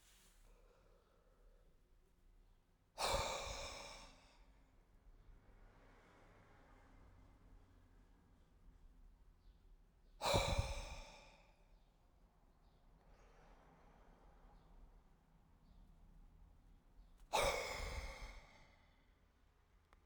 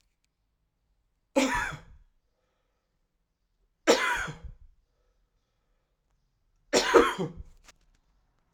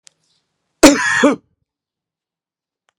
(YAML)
exhalation_length: 20.1 s
exhalation_amplitude: 2775
exhalation_signal_mean_std_ratio: 0.37
three_cough_length: 8.5 s
three_cough_amplitude: 19362
three_cough_signal_mean_std_ratio: 0.29
cough_length: 3.0 s
cough_amplitude: 32768
cough_signal_mean_std_ratio: 0.3
survey_phase: alpha (2021-03-01 to 2021-08-12)
age: 45-64
gender: Male
wearing_mask: 'No'
symptom_shortness_of_breath: true
symptom_fatigue: true
symptom_headache: true
symptom_change_to_sense_of_smell_or_taste: true
symptom_loss_of_taste: true
symptom_onset: 3 days
smoker_status: Ex-smoker
respiratory_condition_asthma: false
respiratory_condition_other: false
recruitment_source: Test and Trace
submission_delay: 2 days
covid_test_result: Positive
covid_test_method: RT-qPCR
covid_ct_value: 12.6
covid_ct_gene: ORF1ab gene
covid_ct_mean: 13.0
covid_viral_load: 53000000 copies/ml
covid_viral_load_category: High viral load (>1M copies/ml)